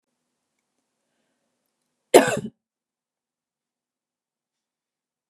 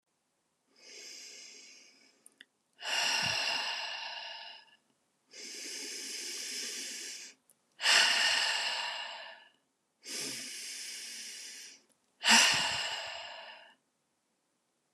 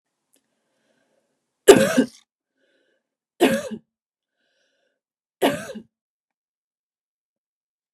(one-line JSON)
{"cough_length": "5.3 s", "cough_amplitude": 32768, "cough_signal_mean_std_ratio": 0.14, "exhalation_length": "14.9 s", "exhalation_amplitude": 11052, "exhalation_signal_mean_std_ratio": 0.48, "three_cough_length": "7.9 s", "three_cough_amplitude": 32768, "three_cough_signal_mean_std_ratio": 0.21, "survey_phase": "beta (2021-08-13 to 2022-03-07)", "age": "18-44", "gender": "Female", "wearing_mask": "No", "symptom_headache": true, "smoker_status": "Never smoked", "respiratory_condition_asthma": false, "respiratory_condition_other": false, "recruitment_source": "REACT", "submission_delay": "15 days", "covid_test_result": "Negative", "covid_test_method": "RT-qPCR", "influenza_a_test_result": "Unknown/Void", "influenza_b_test_result": "Unknown/Void"}